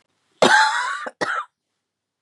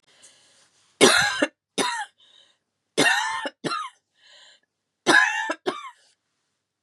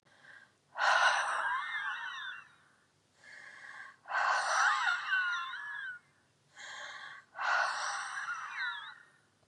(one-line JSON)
{"cough_length": "2.2 s", "cough_amplitude": 29818, "cough_signal_mean_std_ratio": 0.45, "three_cough_length": "6.8 s", "three_cough_amplitude": 32042, "three_cough_signal_mean_std_ratio": 0.39, "exhalation_length": "9.5 s", "exhalation_amplitude": 5939, "exhalation_signal_mean_std_ratio": 0.63, "survey_phase": "beta (2021-08-13 to 2022-03-07)", "age": "45-64", "gender": "Female", "wearing_mask": "No", "symptom_cough_any": true, "symptom_runny_or_blocked_nose": true, "symptom_sore_throat": true, "symptom_fatigue": true, "symptom_headache": true, "symptom_onset": "4 days", "smoker_status": "Never smoked", "respiratory_condition_asthma": false, "respiratory_condition_other": false, "recruitment_source": "Test and Trace", "submission_delay": "2 days", "covid_test_result": "Positive", "covid_test_method": "ePCR"}